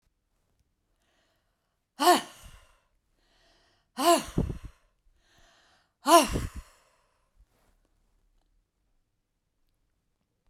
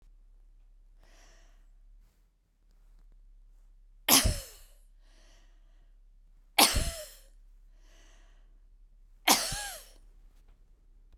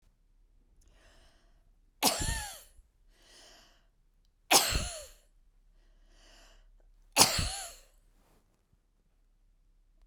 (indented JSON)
{
  "exhalation_length": "10.5 s",
  "exhalation_amplitude": 19728,
  "exhalation_signal_mean_std_ratio": 0.23,
  "three_cough_length": "11.2 s",
  "three_cough_amplitude": 21767,
  "three_cough_signal_mean_std_ratio": 0.27,
  "cough_length": "10.1 s",
  "cough_amplitude": 19022,
  "cough_signal_mean_std_ratio": 0.27,
  "survey_phase": "beta (2021-08-13 to 2022-03-07)",
  "age": "65+",
  "gender": "Female",
  "wearing_mask": "No",
  "symptom_none": true,
  "smoker_status": "Ex-smoker",
  "respiratory_condition_asthma": false,
  "respiratory_condition_other": false,
  "recruitment_source": "REACT",
  "submission_delay": "2 days",
  "covid_test_result": "Negative",
  "covid_test_method": "RT-qPCR"
}